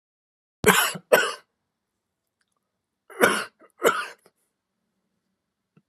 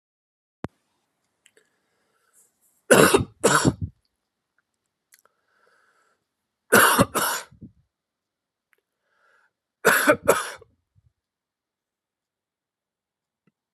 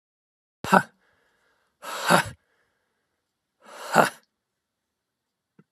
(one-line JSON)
{"cough_length": "5.9 s", "cough_amplitude": 30248, "cough_signal_mean_std_ratio": 0.29, "three_cough_length": "13.7 s", "three_cough_amplitude": 30485, "three_cough_signal_mean_std_ratio": 0.26, "exhalation_length": "5.7 s", "exhalation_amplitude": 32403, "exhalation_signal_mean_std_ratio": 0.23, "survey_phase": "beta (2021-08-13 to 2022-03-07)", "age": "45-64", "gender": "Male", "wearing_mask": "No", "symptom_none": true, "smoker_status": "Never smoked", "respiratory_condition_asthma": false, "respiratory_condition_other": false, "recruitment_source": "REACT", "submission_delay": "2 days", "covid_test_result": "Negative", "covid_test_method": "RT-qPCR"}